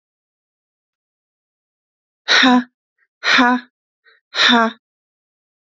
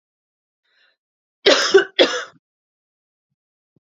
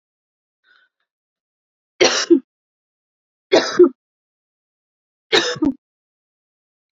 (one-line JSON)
{"exhalation_length": "5.6 s", "exhalation_amplitude": 31369, "exhalation_signal_mean_std_ratio": 0.35, "cough_length": "3.9 s", "cough_amplitude": 31240, "cough_signal_mean_std_ratio": 0.28, "three_cough_length": "6.9 s", "three_cough_amplitude": 29676, "three_cough_signal_mean_std_ratio": 0.27, "survey_phase": "alpha (2021-03-01 to 2021-08-12)", "age": "18-44", "gender": "Female", "wearing_mask": "No", "symptom_cough_any": true, "symptom_shortness_of_breath": true, "symptom_fatigue": true, "symptom_headache": true, "symptom_change_to_sense_of_smell_or_taste": true, "smoker_status": "Never smoked", "respiratory_condition_asthma": false, "respiratory_condition_other": false, "recruitment_source": "Test and Trace", "submission_delay": "3 days", "covid_test_result": "Positive", "covid_test_method": "RT-qPCR"}